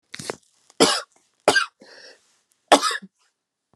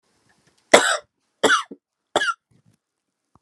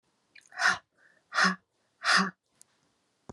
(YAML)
three_cough_length: 3.8 s
three_cough_amplitude: 32767
three_cough_signal_mean_std_ratio: 0.3
cough_length: 3.4 s
cough_amplitude: 32768
cough_signal_mean_std_ratio: 0.29
exhalation_length: 3.3 s
exhalation_amplitude: 8913
exhalation_signal_mean_std_ratio: 0.35
survey_phase: alpha (2021-03-01 to 2021-08-12)
age: 18-44
gender: Female
wearing_mask: 'No'
symptom_cough_any: true
symptom_shortness_of_breath: true
symptom_fatigue: true
symptom_fever_high_temperature: true
symptom_headache: true
smoker_status: Never smoked
respiratory_condition_asthma: false
respiratory_condition_other: false
recruitment_source: Test and Trace
submission_delay: 1 day
covid_test_result: Positive
covid_test_method: LFT